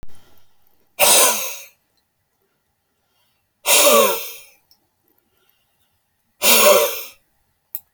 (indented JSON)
{
  "exhalation_length": "7.9 s",
  "exhalation_amplitude": 32768,
  "exhalation_signal_mean_std_ratio": 0.38,
  "survey_phase": "beta (2021-08-13 to 2022-03-07)",
  "age": "65+",
  "gender": "Male",
  "wearing_mask": "No",
  "symptom_runny_or_blocked_nose": true,
  "smoker_status": "Ex-smoker",
  "respiratory_condition_asthma": false,
  "respiratory_condition_other": false,
  "recruitment_source": "REACT",
  "submission_delay": "1 day",
  "covid_test_result": "Negative",
  "covid_test_method": "RT-qPCR"
}